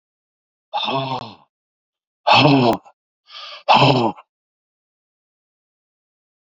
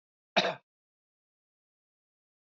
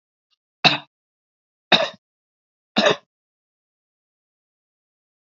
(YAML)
exhalation_length: 6.5 s
exhalation_amplitude: 32768
exhalation_signal_mean_std_ratio: 0.36
cough_length: 2.5 s
cough_amplitude: 7265
cough_signal_mean_std_ratio: 0.19
three_cough_length: 5.2 s
three_cough_amplitude: 30864
three_cough_signal_mean_std_ratio: 0.21
survey_phase: beta (2021-08-13 to 2022-03-07)
age: 65+
gender: Male
wearing_mask: 'No'
symptom_none: true
smoker_status: Ex-smoker
respiratory_condition_asthma: false
respiratory_condition_other: true
recruitment_source: REACT
submission_delay: 3 days
covid_test_result: Positive
covid_test_method: RT-qPCR
covid_ct_value: 37.0
covid_ct_gene: N gene
influenza_a_test_result: Negative
influenza_b_test_result: Negative